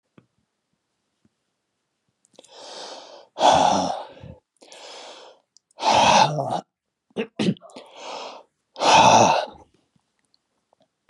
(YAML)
exhalation_length: 11.1 s
exhalation_amplitude: 26209
exhalation_signal_mean_std_ratio: 0.37
survey_phase: beta (2021-08-13 to 2022-03-07)
age: 45-64
gender: Male
wearing_mask: 'No'
symptom_runny_or_blocked_nose: true
symptom_headache: true
smoker_status: Never smoked
respiratory_condition_asthma: false
respiratory_condition_other: false
recruitment_source: Test and Trace
submission_delay: 1 day
covid_test_result: Positive
covid_test_method: LFT